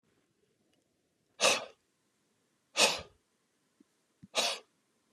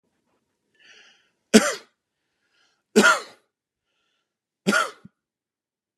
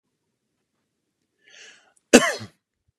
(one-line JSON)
{"exhalation_length": "5.1 s", "exhalation_amplitude": 10744, "exhalation_signal_mean_std_ratio": 0.27, "three_cough_length": "6.0 s", "three_cough_amplitude": 32767, "three_cough_signal_mean_std_ratio": 0.23, "cough_length": "3.0 s", "cough_amplitude": 32767, "cough_signal_mean_std_ratio": 0.17, "survey_phase": "beta (2021-08-13 to 2022-03-07)", "age": "18-44", "gender": "Male", "wearing_mask": "No", "symptom_none": true, "smoker_status": "Never smoked", "respiratory_condition_asthma": false, "respiratory_condition_other": false, "recruitment_source": "REACT", "submission_delay": "3 days", "covid_test_result": "Negative", "covid_test_method": "RT-qPCR"}